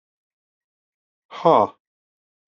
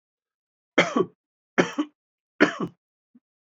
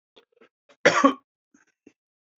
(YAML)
exhalation_length: 2.5 s
exhalation_amplitude: 25388
exhalation_signal_mean_std_ratio: 0.22
three_cough_length: 3.6 s
three_cough_amplitude: 22531
three_cough_signal_mean_std_ratio: 0.28
cough_length: 2.4 s
cough_amplitude: 26845
cough_signal_mean_std_ratio: 0.24
survey_phase: beta (2021-08-13 to 2022-03-07)
age: 45-64
gender: Male
wearing_mask: 'No'
symptom_cough_any: true
symptom_runny_or_blocked_nose: true
symptom_change_to_sense_of_smell_or_taste: true
symptom_loss_of_taste: true
smoker_status: Ex-smoker
respiratory_condition_asthma: false
respiratory_condition_other: false
recruitment_source: Test and Trace
submission_delay: 1 day
covid_test_result: Positive
covid_test_method: RT-qPCR